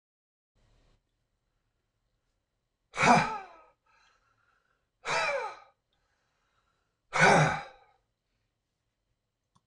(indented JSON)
{
  "exhalation_length": "9.7 s",
  "exhalation_amplitude": 13507,
  "exhalation_signal_mean_std_ratio": 0.27,
  "survey_phase": "beta (2021-08-13 to 2022-03-07)",
  "age": "65+",
  "gender": "Male",
  "wearing_mask": "No",
  "symptom_none": true,
  "smoker_status": "Never smoked",
  "respiratory_condition_asthma": false,
  "respiratory_condition_other": false,
  "recruitment_source": "REACT",
  "submission_delay": "0 days",
  "covid_test_result": "Negative",
  "covid_test_method": "RT-qPCR"
}